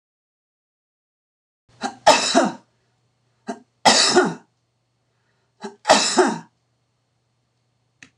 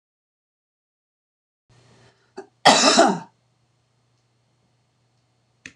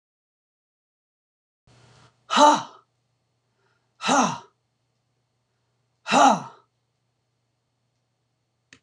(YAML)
three_cough_length: 8.2 s
three_cough_amplitude: 26028
three_cough_signal_mean_std_ratio: 0.32
cough_length: 5.8 s
cough_amplitude: 26028
cough_signal_mean_std_ratio: 0.24
exhalation_length: 8.8 s
exhalation_amplitude: 25335
exhalation_signal_mean_std_ratio: 0.25
survey_phase: beta (2021-08-13 to 2022-03-07)
age: 65+
gender: Female
wearing_mask: 'No'
symptom_none: true
smoker_status: Never smoked
respiratory_condition_asthma: false
respiratory_condition_other: false
recruitment_source: REACT
submission_delay: 1 day
covid_test_result: Negative
covid_test_method: RT-qPCR